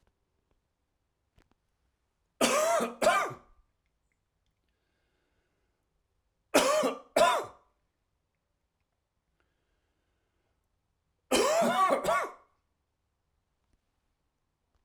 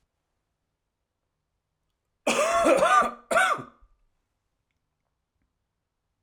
{"three_cough_length": "14.8 s", "three_cough_amplitude": 10849, "three_cough_signal_mean_std_ratio": 0.33, "cough_length": "6.2 s", "cough_amplitude": 12676, "cough_signal_mean_std_ratio": 0.35, "survey_phase": "alpha (2021-03-01 to 2021-08-12)", "age": "45-64", "gender": "Male", "wearing_mask": "No", "symptom_cough_any": true, "symptom_onset": "2 days", "smoker_status": "Never smoked", "respiratory_condition_asthma": false, "respiratory_condition_other": false, "recruitment_source": "Test and Trace", "submission_delay": "2 days", "covid_test_result": "Positive", "covid_test_method": "RT-qPCR", "covid_ct_value": 20.0, "covid_ct_gene": "ORF1ab gene", "covid_ct_mean": 20.6, "covid_viral_load": "170000 copies/ml", "covid_viral_load_category": "Low viral load (10K-1M copies/ml)"}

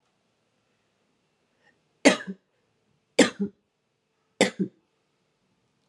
{"three_cough_length": "5.9 s", "three_cough_amplitude": 27864, "three_cough_signal_mean_std_ratio": 0.2, "survey_phase": "beta (2021-08-13 to 2022-03-07)", "age": "18-44", "gender": "Female", "wearing_mask": "No", "symptom_cough_any": true, "symptom_runny_or_blocked_nose": true, "symptom_shortness_of_breath": true, "symptom_sore_throat": true, "symptom_diarrhoea": true, "symptom_fatigue": true, "symptom_fever_high_temperature": true, "symptom_headache": true, "symptom_loss_of_taste": true, "symptom_onset": "5 days", "smoker_status": "Ex-smoker", "respiratory_condition_asthma": false, "respiratory_condition_other": false, "recruitment_source": "Test and Trace", "submission_delay": "2 days", "covid_test_result": "Positive", "covid_test_method": "RT-qPCR", "covid_ct_value": 15.2, "covid_ct_gene": "ORF1ab gene", "covid_ct_mean": 15.7, "covid_viral_load": "7000000 copies/ml", "covid_viral_load_category": "High viral load (>1M copies/ml)"}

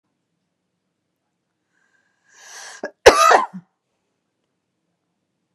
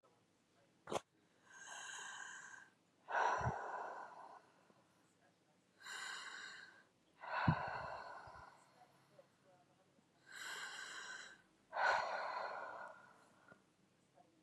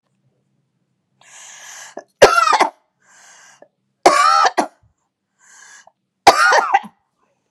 {"cough_length": "5.5 s", "cough_amplitude": 32768, "cough_signal_mean_std_ratio": 0.2, "exhalation_length": "14.4 s", "exhalation_amplitude": 2913, "exhalation_signal_mean_std_ratio": 0.47, "three_cough_length": "7.5 s", "three_cough_amplitude": 32768, "three_cough_signal_mean_std_ratio": 0.35, "survey_phase": "beta (2021-08-13 to 2022-03-07)", "age": "45-64", "gender": "Female", "wearing_mask": "No", "symptom_none": true, "smoker_status": "Ex-smoker", "respiratory_condition_asthma": false, "respiratory_condition_other": false, "recruitment_source": "REACT", "submission_delay": "2 days", "covid_test_result": "Negative", "covid_test_method": "RT-qPCR", "influenza_a_test_result": "Negative", "influenza_b_test_result": "Negative"}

